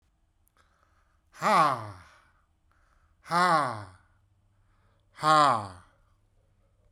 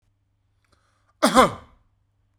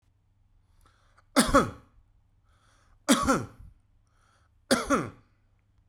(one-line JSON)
{"exhalation_length": "6.9 s", "exhalation_amplitude": 14741, "exhalation_signal_mean_std_ratio": 0.34, "cough_length": "2.4 s", "cough_amplitude": 26977, "cough_signal_mean_std_ratio": 0.25, "three_cough_length": "5.9 s", "three_cough_amplitude": 15079, "three_cough_signal_mean_std_ratio": 0.32, "survey_phase": "beta (2021-08-13 to 2022-03-07)", "age": "45-64", "gender": "Male", "wearing_mask": "No", "symptom_cough_any": true, "symptom_runny_or_blocked_nose": true, "smoker_status": "Never smoked", "respiratory_condition_asthma": false, "respiratory_condition_other": false, "recruitment_source": "Test and Trace", "submission_delay": "2 days", "covid_test_result": "Positive", "covid_test_method": "RT-qPCR", "covid_ct_value": 31.0, "covid_ct_gene": "ORF1ab gene", "covid_ct_mean": 31.5, "covid_viral_load": "45 copies/ml", "covid_viral_load_category": "Minimal viral load (< 10K copies/ml)"}